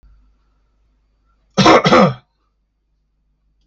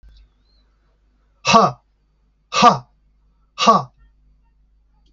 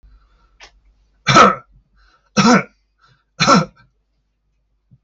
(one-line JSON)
{"cough_length": "3.7 s", "cough_amplitude": 32767, "cough_signal_mean_std_ratio": 0.31, "exhalation_length": "5.1 s", "exhalation_amplitude": 27805, "exhalation_signal_mean_std_ratio": 0.29, "three_cough_length": "5.0 s", "three_cough_amplitude": 30197, "three_cough_signal_mean_std_ratio": 0.32, "survey_phase": "alpha (2021-03-01 to 2021-08-12)", "age": "18-44", "gender": "Male", "wearing_mask": "No", "symptom_none": true, "smoker_status": "Never smoked", "respiratory_condition_asthma": false, "respiratory_condition_other": false, "recruitment_source": "REACT", "submission_delay": "1 day", "covid_test_result": "Negative", "covid_test_method": "RT-qPCR"}